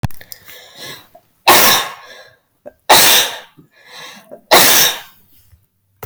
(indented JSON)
{
  "three_cough_length": "6.1 s",
  "three_cough_amplitude": 32768,
  "three_cough_signal_mean_std_ratio": 0.41,
  "survey_phase": "beta (2021-08-13 to 2022-03-07)",
  "age": "45-64",
  "gender": "Female",
  "wearing_mask": "No",
  "symptom_none": true,
  "smoker_status": "Ex-smoker",
  "respiratory_condition_asthma": false,
  "respiratory_condition_other": false,
  "recruitment_source": "REACT",
  "submission_delay": "9 days",
  "covid_test_result": "Negative",
  "covid_test_method": "RT-qPCR"
}